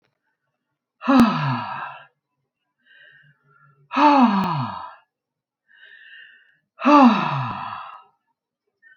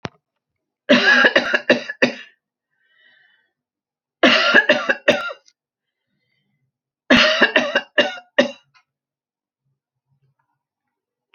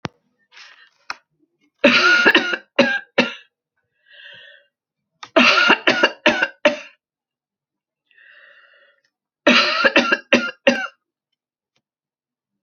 {"exhalation_length": "9.0 s", "exhalation_amplitude": 25430, "exhalation_signal_mean_std_ratio": 0.39, "cough_length": "11.3 s", "cough_amplitude": 30382, "cough_signal_mean_std_ratio": 0.36, "three_cough_length": "12.6 s", "three_cough_amplitude": 31579, "three_cough_signal_mean_std_ratio": 0.38, "survey_phase": "alpha (2021-03-01 to 2021-08-12)", "age": "65+", "gender": "Female", "wearing_mask": "No", "symptom_none": true, "smoker_status": "Ex-smoker", "respiratory_condition_asthma": false, "respiratory_condition_other": false, "recruitment_source": "REACT", "submission_delay": "1 day", "covid_test_result": "Negative", "covid_test_method": "RT-qPCR"}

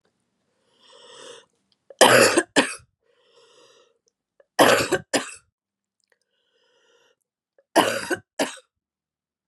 {"three_cough_length": "9.5 s", "three_cough_amplitude": 31850, "three_cough_signal_mean_std_ratio": 0.29, "survey_phase": "beta (2021-08-13 to 2022-03-07)", "age": "45-64", "gender": "Female", "wearing_mask": "No", "symptom_cough_any": true, "symptom_runny_or_blocked_nose": true, "symptom_diarrhoea": true, "symptom_onset": "4 days", "smoker_status": "Never smoked", "respiratory_condition_asthma": false, "respiratory_condition_other": false, "recruitment_source": "Test and Trace", "submission_delay": "2 days", "covid_test_result": "Positive", "covid_test_method": "RT-qPCR", "covid_ct_value": 22.2, "covid_ct_gene": "N gene"}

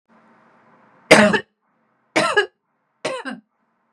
{"three_cough_length": "3.9 s", "three_cough_amplitude": 32768, "three_cough_signal_mean_std_ratio": 0.31, "survey_phase": "beta (2021-08-13 to 2022-03-07)", "age": "45-64", "gender": "Female", "wearing_mask": "No", "symptom_none": true, "symptom_onset": "12 days", "smoker_status": "Never smoked", "respiratory_condition_asthma": true, "respiratory_condition_other": false, "recruitment_source": "REACT", "submission_delay": "6 days", "covid_test_result": "Negative", "covid_test_method": "RT-qPCR", "influenza_a_test_result": "Negative", "influenza_b_test_result": "Negative"}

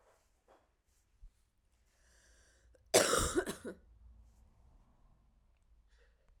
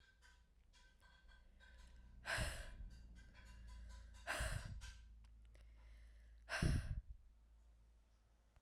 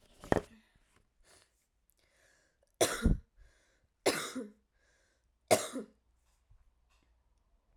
{"cough_length": "6.4 s", "cough_amplitude": 8739, "cough_signal_mean_std_ratio": 0.25, "exhalation_length": "8.6 s", "exhalation_amplitude": 1807, "exhalation_signal_mean_std_ratio": 0.5, "three_cough_length": "7.8 s", "three_cough_amplitude": 13087, "three_cough_signal_mean_std_ratio": 0.25, "survey_phase": "beta (2021-08-13 to 2022-03-07)", "age": "18-44", "gender": "Female", "wearing_mask": "No", "symptom_cough_any": true, "symptom_runny_or_blocked_nose": true, "symptom_fatigue": true, "symptom_change_to_sense_of_smell_or_taste": true, "symptom_onset": "7 days", "smoker_status": "Never smoked", "respiratory_condition_asthma": false, "respiratory_condition_other": false, "recruitment_source": "Test and Trace", "submission_delay": "1 day", "covid_test_result": "Positive", "covid_test_method": "RT-qPCR", "covid_ct_value": 13.5, "covid_ct_gene": "ORF1ab gene"}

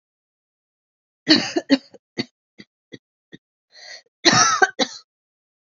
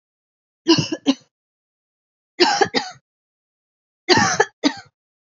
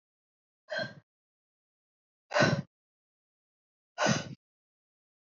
{"cough_length": "5.7 s", "cough_amplitude": 32767, "cough_signal_mean_std_ratio": 0.29, "three_cough_length": "5.2 s", "three_cough_amplitude": 31489, "three_cough_signal_mean_std_ratio": 0.35, "exhalation_length": "5.4 s", "exhalation_amplitude": 8329, "exhalation_signal_mean_std_ratio": 0.27, "survey_phase": "alpha (2021-03-01 to 2021-08-12)", "age": "18-44", "gender": "Female", "wearing_mask": "No", "symptom_cough_any": true, "symptom_shortness_of_breath": true, "symptom_fatigue": true, "symptom_change_to_sense_of_smell_or_taste": true, "symptom_loss_of_taste": true, "symptom_onset": "4 days", "smoker_status": "Current smoker (1 to 10 cigarettes per day)", "respiratory_condition_asthma": false, "respiratory_condition_other": false, "recruitment_source": "Test and Trace", "submission_delay": "2 days", "covid_test_result": "Positive", "covid_test_method": "RT-qPCR", "covid_ct_value": 13.8, "covid_ct_gene": "ORF1ab gene", "covid_ct_mean": 14.3, "covid_viral_load": "21000000 copies/ml", "covid_viral_load_category": "High viral load (>1M copies/ml)"}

